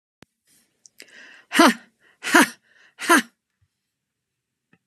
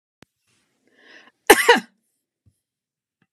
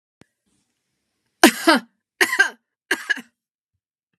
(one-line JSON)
{"exhalation_length": "4.9 s", "exhalation_amplitude": 32767, "exhalation_signal_mean_std_ratio": 0.26, "cough_length": "3.3 s", "cough_amplitude": 32768, "cough_signal_mean_std_ratio": 0.2, "three_cough_length": "4.2 s", "three_cough_amplitude": 32768, "three_cough_signal_mean_std_ratio": 0.27, "survey_phase": "beta (2021-08-13 to 2022-03-07)", "age": "65+", "gender": "Female", "wearing_mask": "No", "symptom_fatigue": true, "smoker_status": "Ex-smoker", "respiratory_condition_asthma": false, "respiratory_condition_other": false, "recruitment_source": "REACT", "submission_delay": "2 days", "covid_test_result": "Negative", "covid_test_method": "RT-qPCR"}